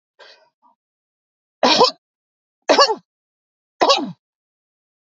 {
  "three_cough_length": "5.0 s",
  "three_cough_amplitude": 32768,
  "three_cough_signal_mean_std_ratio": 0.3,
  "survey_phase": "beta (2021-08-13 to 2022-03-07)",
  "age": "45-64",
  "gender": "Female",
  "wearing_mask": "No",
  "symptom_none": true,
  "smoker_status": "Ex-smoker",
  "respiratory_condition_asthma": false,
  "respiratory_condition_other": false,
  "recruitment_source": "REACT",
  "submission_delay": "0 days",
  "covid_test_result": "Negative",
  "covid_test_method": "RT-qPCR",
  "influenza_a_test_result": "Negative",
  "influenza_b_test_result": "Negative"
}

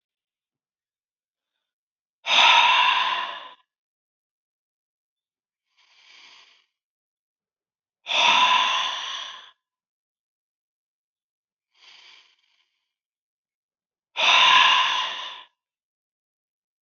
{
  "exhalation_length": "16.8 s",
  "exhalation_amplitude": 21957,
  "exhalation_signal_mean_std_ratio": 0.34,
  "survey_phase": "beta (2021-08-13 to 2022-03-07)",
  "age": "65+",
  "gender": "Male",
  "wearing_mask": "No",
  "symptom_cough_any": true,
  "symptom_shortness_of_breath": true,
  "symptom_onset": "11 days",
  "smoker_status": "Never smoked",
  "respiratory_condition_asthma": true,
  "respiratory_condition_other": false,
  "recruitment_source": "REACT",
  "submission_delay": "3 days",
  "covid_test_result": "Negative",
  "covid_test_method": "RT-qPCR",
  "influenza_a_test_result": "Negative",
  "influenza_b_test_result": "Negative"
}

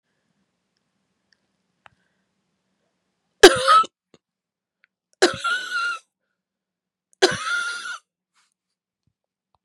{
  "three_cough_length": "9.6 s",
  "three_cough_amplitude": 32768,
  "three_cough_signal_mean_std_ratio": 0.24,
  "survey_phase": "beta (2021-08-13 to 2022-03-07)",
  "age": "45-64",
  "gender": "Female",
  "wearing_mask": "No",
  "symptom_cough_any": true,
  "symptom_runny_or_blocked_nose": true,
  "symptom_shortness_of_breath": true,
  "symptom_sore_throat": true,
  "symptom_fatigue": true,
  "symptom_fever_high_temperature": true,
  "symptom_headache": true,
  "symptom_onset": "7 days",
  "smoker_status": "Never smoked",
  "respiratory_condition_asthma": true,
  "respiratory_condition_other": false,
  "recruitment_source": "Test and Trace",
  "submission_delay": "1 day",
  "covid_test_result": "Positive",
  "covid_test_method": "ePCR"
}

